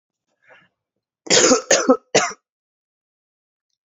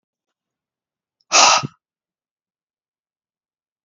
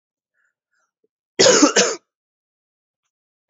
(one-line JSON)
{"three_cough_length": "3.8 s", "three_cough_amplitude": 32768, "three_cough_signal_mean_std_ratio": 0.33, "exhalation_length": "3.8 s", "exhalation_amplitude": 31734, "exhalation_signal_mean_std_ratio": 0.22, "cough_length": "3.5 s", "cough_amplitude": 29760, "cough_signal_mean_std_ratio": 0.3, "survey_phase": "beta (2021-08-13 to 2022-03-07)", "age": "18-44", "gender": "Male", "wearing_mask": "No", "symptom_cough_any": true, "symptom_runny_or_blocked_nose": true, "symptom_sore_throat": true, "smoker_status": "Prefer not to say", "respiratory_condition_asthma": false, "respiratory_condition_other": false, "recruitment_source": "Test and Trace", "submission_delay": "1 day", "covid_test_result": "Negative", "covid_test_method": "LFT"}